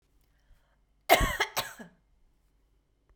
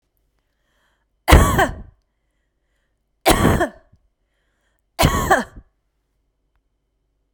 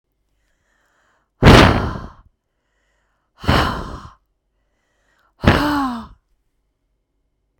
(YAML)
cough_length: 3.2 s
cough_amplitude: 16311
cough_signal_mean_std_ratio: 0.27
three_cough_length: 7.3 s
three_cough_amplitude: 32768
three_cough_signal_mean_std_ratio: 0.31
exhalation_length: 7.6 s
exhalation_amplitude: 32768
exhalation_signal_mean_std_ratio: 0.3
survey_phase: beta (2021-08-13 to 2022-03-07)
age: 45-64
gender: Female
wearing_mask: 'No'
symptom_none: true
smoker_status: Never smoked
respiratory_condition_asthma: false
respiratory_condition_other: false
recruitment_source: REACT
submission_delay: 3 days
covid_test_result: Negative
covid_test_method: RT-qPCR